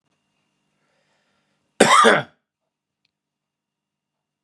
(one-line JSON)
{"cough_length": "4.4 s", "cough_amplitude": 32767, "cough_signal_mean_std_ratio": 0.24, "survey_phase": "beta (2021-08-13 to 2022-03-07)", "age": "45-64", "gender": "Male", "wearing_mask": "No", "symptom_cough_any": true, "symptom_sore_throat": true, "symptom_headache": true, "symptom_onset": "6 days", "smoker_status": "Never smoked", "respiratory_condition_asthma": false, "respiratory_condition_other": false, "recruitment_source": "Test and Trace", "submission_delay": "2 days", "covid_test_result": "Negative", "covid_test_method": "RT-qPCR"}